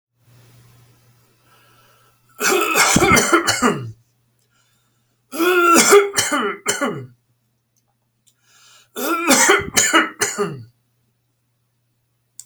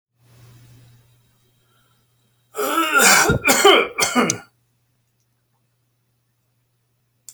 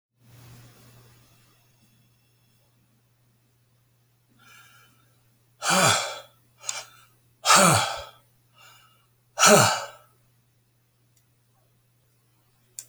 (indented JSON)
{
  "three_cough_length": "12.5 s",
  "three_cough_amplitude": 32767,
  "three_cough_signal_mean_std_ratio": 0.46,
  "cough_length": "7.3 s",
  "cough_amplitude": 32578,
  "cough_signal_mean_std_ratio": 0.37,
  "exhalation_length": "12.9 s",
  "exhalation_amplitude": 26466,
  "exhalation_signal_mean_std_ratio": 0.27,
  "survey_phase": "alpha (2021-03-01 to 2021-08-12)",
  "age": "65+",
  "gender": "Male",
  "wearing_mask": "No",
  "symptom_none": true,
  "smoker_status": "Never smoked",
  "respiratory_condition_asthma": false,
  "respiratory_condition_other": false,
  "recruitment_source": "REACT",
  "submission_delay": "1 day",
  "covid_test_result": "Negative",
  "covid_test_method": "RT-qPCR"
}